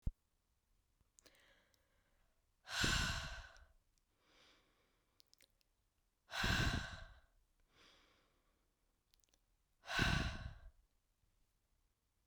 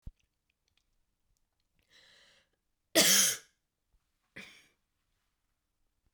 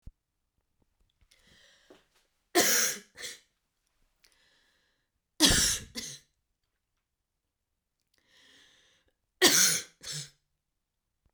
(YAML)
exhalation_length: 12.3 s
exhalation_amplitude: 2943
exhalation_signal_mean_std_ratio: 0.33
cough_length: 6.1 s
cough_amplitude: 10646
cough_signal_mean_std_ratio: 0.21
three_cough_length: 11.3 s
three_cough_amplitude: 17241
three_cough_signal_mean_std_ratio: 0.27
survey_phase: beta (2021-08-13 to 2022-03-07)
age: 18-44
gender: Female
wearing_mask: 'No'
symptom_cough_any: true
symptom_shortness_of_breath: true
symptom_fatigue: true
smoker_status: Never smoked
respiratory_condition_asthma: false
respiratory_condition_other: false
recruitment_source: REACT
submission_delay: 3 days
covid_test_result: Negative
covid_test_method: RT-qPCR